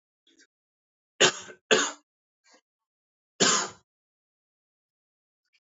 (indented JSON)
{
  "cough_length": "5.7 s",
  "cough_amplitude": 17145,
  "cough_signal_mean_std_ratio": 0.24,
  "survey_phase": "beta (2021-08-13 to 2022-03-07)",
  "age": "18-44",
  "gender": "Male",
  "wearing_mask": "No",
  "symptom_none": true,
  "symptom_onset": "8 days",
  "smoker_status": "Never smoked",
  "respiratory_condition_asthma": false,
  "respiratory_condition_other": false,
  "recruitment_source": "REACT",
  "submission_delay": "1 day",
  "covid_test_result": "Negative",
  "covid_test_method": "RT-qPCR",
  "influenza_a_test_result": "Negative",
  "influenza_b_test_result": "Negative"
}